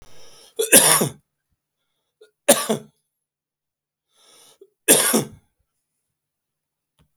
three_cough_length: 7.2 s
three_cough_amplitude: 32768
three_cough_signal_mean_std_ratio: 0.28
survey_phase: beta (2021-08-13 to 2022-03-07)
age: 65+
gender: Male
wearing_mask: 'No'
symptom_new_continuous_cough: true
symptom_fatigue: true
symptom_onset: 3 days
smoker_status: Ex-smoker
respiratory_condition_asthma: false
respiratory_condition_other: false
recruitment_source: Test and Trace
submission_delay: 1 day
covid_test_result: Positive
covid_test_method: RT-qPCR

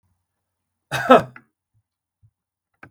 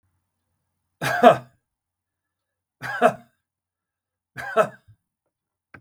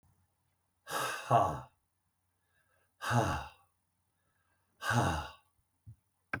cough_length: 2.9 s
cough_amplitude: 32767
cough_signal_mean_std_ratio: 0.2
three_cough_length: 5.8 s
three_cough_amplitude: 32768
three_cough_signal_mean_std_ratio: 0.24
exhalation_length: 6.4 s
exhalation_amplitude: 6911
exhalation_signal_mean_std_ratio: 0.37
survey_phase: beta (2021-08-13 to 2022-03-07)
age: 45-64
gender: Male
wearing_mask: 'No'
symptom_none: true
symptom_onset: 12 days
smoker_status: Ex-smoker
respiratory_condition_asthma: false
respiratory_condition_other: false
recruitment_source: REACT
submission_delay: 1 day
covid_test_result: Negative
covid_test_method: RT-qPCR
influenza_a_test_result: Unknown/Void
influenza_b_test_result: Unknown/Void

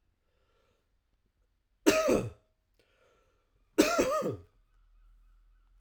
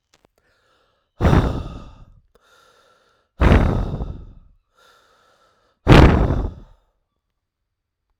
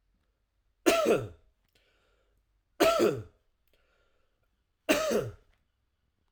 cough_length: 5.8 s
cough_amplitude: 14639
cough_signal_mean_std_ratio: 0.32
exhalation_length: 8.2 s
exhalation_amplitude: 32768
exhalation_signal_mean_std_ratio: 0.34
three_cough_length: 6.3 s
three_cough_amplitude: 11971
three_cough_signal_mean_std_ratio: 0.35
survey_phase: alpha (2021-03-01 to 2021-08-12)
age: 18-44
gender: Male
wearing_mask: 'No'
symptom_headache: true
smoker_status: Ex-smoker
respiratory_condition_asthma: true
respiratory_condition_other: false
recruitment_source: Test and Trace
submission_delay: 1 day
covid_test_result: Positive
covid_test_method: RT-qPCR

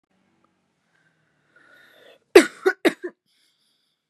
cough_length: 4.1 s
cough_amplitude: 32768
cough_signal_mean_std_ratio: 0.17
survey_phase: beta (2021-08-13 to 2022-03-07)
age: 18-44
gender: Female
wearing_mask: 'No'
symptom_cough_any: true
symptom_runny_or_blocked_nose: true
symptom_sore_throat: true
symptom_diarrhoea: true
symptom_fatigue: true
symptom_headache: true
symptom_loss_of_taste: true
symptom_onset: 5 days
smoker_status: Ex-smoker
respiratory_condition_asthma: false
respiratory_condition_other: false
recruitment_source: Test and Trace
submission_delay: 2 days
covid_test_result: Positive
covid_test_method: RT-qPCR
covid_ct_value: 18.2
covid_ct_gene: ORF1ab gene
covid_ct_mean: 18.4
covid_viral_load: 930000 copies/ml
covid_viral_load_category: Low viral load (10K-1M copies/ml)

